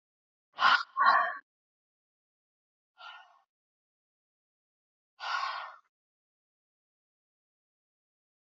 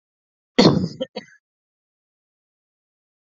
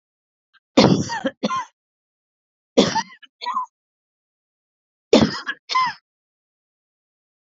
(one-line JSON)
{"exhalation_length": "8.4 s", "exhalation_amplitude": 9151, "exhalation_signal_mean_std_ratio": 0.25, "cough_length": "3.2 s", "cough_amplitude": 29744, "cough_signal_mean_std_ratio": 0.23, "three_cough_length": "7.6 s", "three_cough_amplitude": 29010, "three_cough_signal_mean_std_ratio": 0.32, "survey_phase": "beta (2021-08-13 to 2022-03-07)", "age": "45-64", "gender": "Female", "wearing_mask": "No", "symptom_runny_or_blocked_nose": true, "symptom_fever_high_temperature": true, "symptom_headache": true, "symptom_onset": "2 days", "smoker_status": "Current smoker (1 to 10 cigarettes per day)", "respiratory_condition_asthma": false, "respiratory_condition_other": false, "recruitment_source": "Test and Trace", "submission_delay": "2 days", "covid_test_result": "Positive", "covid_test_method": "RT-qPCR", "covid_ct_value": 14.9, "covid_ct_gene": "ORF1ab gene", "covid_ct_mean": 15.3, "covid_viral_load": "9400000 copies/ml", "covid_viral_load_category": "High viral load (>1M copies/ml)"}